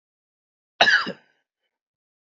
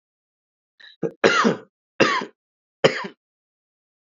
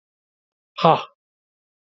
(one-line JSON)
{"cough_length": "2.2 s", "cough_amplitude": 29558, "cough_signal_mean_std_ratio": 0.26, "three_cough_length": "4.0 s", "three_cough_amplitude": 28941, "three_cough_signal_mean_std_ratio": 0.33, "exhalation_length": "1.9 s", "exhalation_amplitude": 27405, "exhalation_signal_mean_std_ratio": 0.22, "survey_phase": "beta (2021-08-13 to 2022-03-07)", "age": "18-44", "gender": "Male", "wearing_mask": "Yes", "symptom_none": true, "smoker_status": "Never smoked", "respiratory_condition_asthma": false, "respiratory_condition_other": false, "recruitment_source": "REACT", "submission_delay": "1 day", "covid_test_result": "Negative", "covid_test_method": "RT-qPCR", "influenza_a_test_result": "Negative", "influenza_b_test_result": "Negative"}